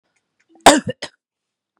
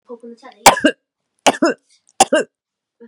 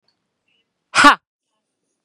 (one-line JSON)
{"cough_length": "1.8 s", "cough_amplitude": 32768, "cough_signal_mean_std_ratio": 0.23, "three_cough_length": "3.1 s", "three_cough_amplitude": 32768, "three_cough_signal_mean_std_ratio": 0.31, "exhalation_length": "2.0 s", "exhalation_amplitude": 32768, "exhalation_signal_mean_std_ratio": 0.23, "survey_phase": "beta (2021-08-13 to 2022-03-07)", "age": "18-44", "gender": "Female", "wearing_mask": "No", "symptom_none": true, "smoker_status": "Ex-smoker", "respiratory_condition_asthma": false, "respiratory_condition_other": false, "recruitment_source": "Test and Trace", "submission_delay": "1 day", "covid_test_result": "Negative", "covid_test_method": "RT-qPCR"}